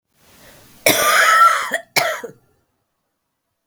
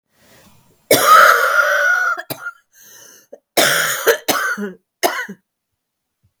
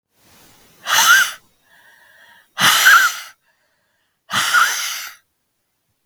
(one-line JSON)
{"cough_length": "3.7 s", "cough_amplitude": 32768, "cough_signal_mean_std_ratio": 0.46, "three_cough_length": "6.4 s", "three_cough_amplitude": 32768, "three_cough_signal_mean_std_ratio": 0.51, "exhalation_length": "6.1 s", "exhalation_amplitude": 32768, "exhalation_signal_mean_std_ratio": 0.42, "survey_phase": "beta (2021-08-13 to 2022-03-07)", "age": "45-64", "gender": "Female", "wearing_mask": "No", "symptom_cough_any": true, "symptom_runny_or_blocked_nose": true, "smoker_status": "Never smoked", "respiratory_condition_asthma": false, "respiratory_condition_other": false, "recruitment_source": "Test and Trace", "submission_delay": "1 day", "covid_test_result": "Positive", "covid_test_method": "RT-qPCR", "covid_ct_value": 19.1, "covid_ct_gene": "N gene"}